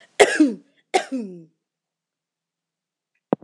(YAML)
cough_length: 3.4 s
cough_amplitude: 26028
cough_signal_mean_std_ratio: 0.28
survey_phase: beta (2021-08-13 to 2022-03-07)
age: 45-64
gender: Female
wearing_mask: 'No'
symptom_none: true
smoker_status: Never smoked
respiratory_condition_asthma: false
respiratory_condition_other: false
recruitment_source: REACT
submission_delay: 1 day
covid_test_result: Negative
covid_test_method: RT-qPCR